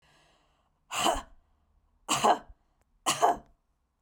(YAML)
three_cough_length: 4.0 s
three_cough_amplitude: 11757
three_cough_signal_mean_std_ratio: 0.35
survey_phase: beta (2021-08-13 to 2022-03-07)
age: 45-64
gender: Female
wearing_mask: 'No'
symptom_sore_throat: true
symptom_onset: 12 days
smoker_status: Never smoked
respiratory_condition_asthma: false
respiratory_condition_other: false
recruitment_source: REACT
submission_delay: 1 day
covid_test_result: Negative
covid_test_method: RT-qPCR
influenza_a_test_result: Negative
influenza_b_test_result: Negative